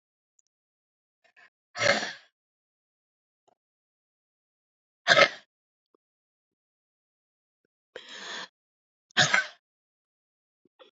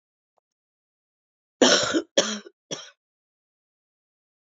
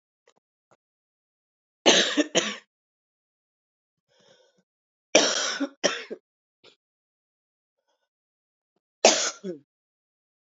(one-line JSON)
{"exhalation_length": "10.9 s", "exhalation_amplitude": 26275, "exhalation_signal_mean_std_ratio": 0.2, "cough_length": "4.4 s", "cough_amplitude": 21840, "cough_signal_mean_std_ratio": 0.27, "three_cough_length": "10.6 s", "three_cough_amplitude": 29688, "three_cough_signal_mean_std_ratio": 0.26, "survey_phase": "beta (2021-08-13 to 2022-03-07)", "age": "45-64", "gender": "Female", "wearing_mask": "No", "symptom_cough_any": true, "symptom_shortness_of_breath": true, "symptom_fatigue": true, "symptom_headache": true, "symptom_change_to_sense_of_smell_or_taste": true, "smoker_status": "Ex-smoker", "respiratory_condition_asthma": false, "respiratory_condition_other": true, "recruitment_source": "Test and Trace", "submission_delay": "2 days", "covid_test_result": "Positive", "covid_test_method": "RT-qPCR", "covid_ct_value": 14.7, "covid_ct_gene": "ORF1ab gene", "covid_ct_mean": 14.9, "covid_viral_load": "13000000 copies/ml", "covid_viral_load_category": "High viral load (>1M copies/ml)"}